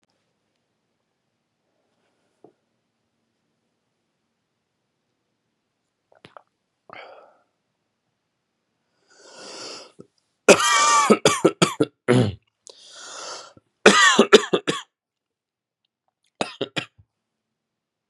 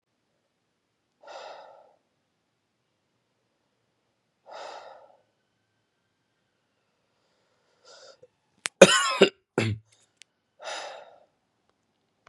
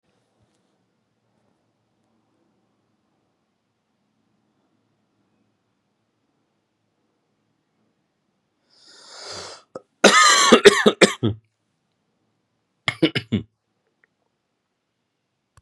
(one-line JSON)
{"three_cough_length": "18.1 s", "three_cough_amplitude": 32768, "three_cough_signal_mean_std_ratio": 0.25, "exhalation_length": "12.3 s", "exhalation_amplitude": 32768, "exhalation_signal_mean_std_ratio": 0.16, "cough_length": "15.6 s", "cough_amplitude": 32768, "cough_signal_mean_std_ratio": 0.21, "survey_phase": "beta (2021-08-13 to 2022-03-07)", "age": "18-44", "gender": "Male", "wearing_mask": "No", "symptom_cough_any": true, "symptom_new_continuous_cough": true, "symptom_shortness_of_breath": true, "symptom_sore_throat": true, "symptom_fatigue": true, "symptom_headache": true, "symptom_onset": "3 days", "smoker_status": "Never smoked", "respiratory_condition_asthma": false, "respiratory_condition_other": false, "recruitment_source": "Test and Trace", "submission_delay": "1 day", "covid_test_result": "Positive", "covid_test_method": "RT-qPCR"}